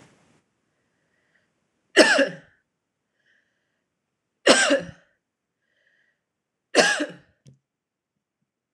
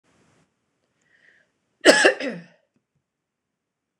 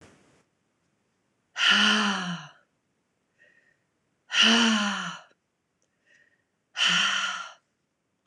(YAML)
three_cough_length: 8.7 s
three_cough_amplitude: 26028
three_cough_signal_mean_std_ratio: 0.25
cough_length: 4.0 s
cough_amplitude: 26028
cough_signal_mean_std_ratio: 0.23
exhalation_length: 8.3 s
exhalation_amplitude: 14246
exhalation_signal_mean_std_ratio: 0.42
survey_phase: beta (2021-08-13 to 2022-03-07)
age: 18-44
gender: Female
wearing_mask: 'No'
symptom_none: true
smoker_status: Never smoked
respiratory_condition_asthma: false
respiratory_condition_other: false
recruitment_source: REACT
submission_delay: 1 day
covid_test_result: Negative
covid_test_method: RT-qPCR
influenza_a_test_result: Negative
influenza_b_test_result: Negative